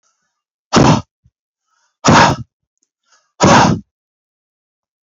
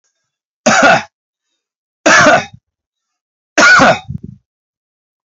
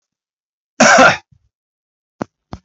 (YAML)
exhalation_length: 5.0 s
exhalation_amplitude: 32139
exhalation_signal_mean_std_ratio: 0.37
three_cough_length: 5.4 s
three_cough_amplitude: 31542
three_cough_signal_mean_std_ratio: 0.42
cough_length: 2.6 s
cough_amplitude: 30772
cough_signal_mean_std_ratio: 0.32
survey_phase: beta (2021-08-13 to 2022-03-07)
age: 45-64
gender: Male
wearing_mask: 'No'
symptom_none: true
smoker_status: Ex-smoker
respiratory_condition_asthma: false
respiratory_condition_other: false
recruitment_source: REACT
submission_delay: 1 day
covid_test_result: Negative
covid_test_method: RT-qPCR